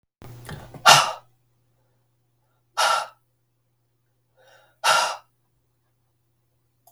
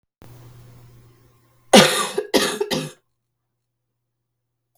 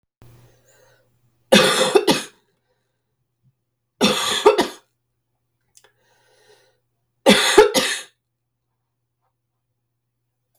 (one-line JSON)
{"exhalation_length": "6.9 s", "exhalation_amplitude": 32768, "exhalation_signal_mean_std_ratio": 0.26, "cough_length": "4.8 s", "cough_amplitude": 32768, "cough_signal_mean_std_ratio": 0.29, "three_cough_length": "10.6 s", "three_cough_amplitude": 32768, "three_cough_signal_mean_std_ratio": 0.31, "survey_phase": "beta (2021-08-13 to 2022-03-07)", "age": "45-64", "gender": "Female", "wearing_mask": "No", "symptom_cough_any": true, "symptom_runny_or_blocked_nose": true, "symptom_onset": "4 days", "smoker_status": "Never smoked", "respiratory_condition_asthma": true, "respiratory_condition_other": false, "recruitment_source": "REACT", "submission_delay": "1 day", "covid_test_result": "Negative", "covid_test_method": "RT-qPCR", "influenza_a_test_result": "Negative", "influenza_b_test_result": "Negative"}